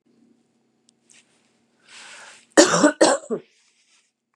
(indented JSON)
{
  "cough_length": "4.4 s",
  "cough_amplitude": 32750,
  "cough_signal_mean_std_ratio": 0.28,
  "survey_phase": "beta (2021-08-13 to 2022-03-07)",
  "age": "45-64",
  "gender": "Female",
  "wearing_mask": "No",
  "symptom_change_to_sense_of_smell_or_taste": true,
  "symptom_loss_of_taste": true,
  "symptom_onset": "4 days",
  "smoker_status": "Never smoked",
  "respiratory_condition_asthma": false,
  "respiratory_condition_other": false,
  "recruitment_source": "Test and Trace",
  "submission_delay": "2 days",
  "covid_test_result": "Positive",
  "covid_test_method": "RT-qPCR",
  "covid_ct_value": 18.6,
  "covid_ct_gene": "ORF1ab gene",
  "covid_ct_mean": 19.7,
  "covid_viral_load": "350000 copies/ml",
  "covid_viral_load_category": "Low viral load (10K-1M copies/ml)"
}